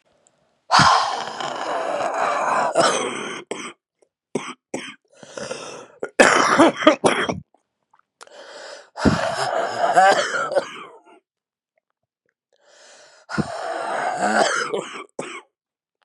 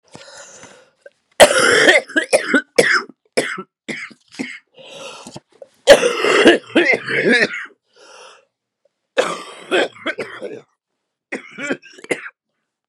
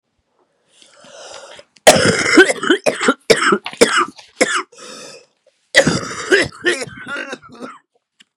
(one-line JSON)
{"exhalation_length": "16.0 s", "exhalation_amplitude": 32768, "exhalation_signal_mean_std_ratio": 0.51, "three_cough_length": "12.9 s", "three_cough_amplitude": 32768, "three_cough_signal_mean_std_ratio": 0.41, "cough_length": "8.4 s", "cough_amplitude": 32768, "cough_signal_mean_std_ratio": 0.44, "survey_phase": "beta (2021-08-13 to 2022-03-07)", "age": "18-44", "gender": "Female", "wearing_mask": "No", "symptom_cough_any": true, "symptom_new_continuous_cough": true, "symptom_runny_or_blocked_nose": true, "symptom_shortness_of_breath": true, "symptom_sore_throat": true, "symptom_fatigue": true, "symptom_headache": true, "symptom_onset": "4 days", "smoker_status": "Current smoker (11 or more cigarettes per day)", "respiratory_condition_asthma": false, "respiratory_condition_other": false, "recruitment_source": "Test and Trace", "submission_delay": "1 day", "covid_test_result": "Positive", "covid_test_method": "RT-qPCR", "covid_ct_value": 29.4, "covid_ct_gene": "ORF1ab gene", "covid_ct_mean": 29.6, "covid_viral_load": "200 copies/ml", "covid_viral_load_category": "Minimal viral load (< 10K copies/ml)"}